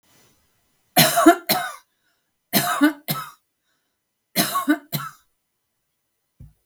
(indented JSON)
{
  "three_cough_length": "6.7 s",
  "three_cough_amplitude": 32768,
  "three_cough_signal_mean_std_ratio": 0.35,
  "survey_phase": "beta (2021-08-13 to 2022-03-07)",
  "age": "65+",
  "gender": "Female",
  "wearing_mask": "No",
  "symptom_none": true,
  "smoker_status": "Never smoked",
  "respiratory_condition_asthma": false,
  "respiratory_condition_other": false,
  "recruitment_source": "REACT",
  "submission_delay": "1 day",
  "covid_test_result": "Negative",
  "covid_test_method": "RT-qPCR"
}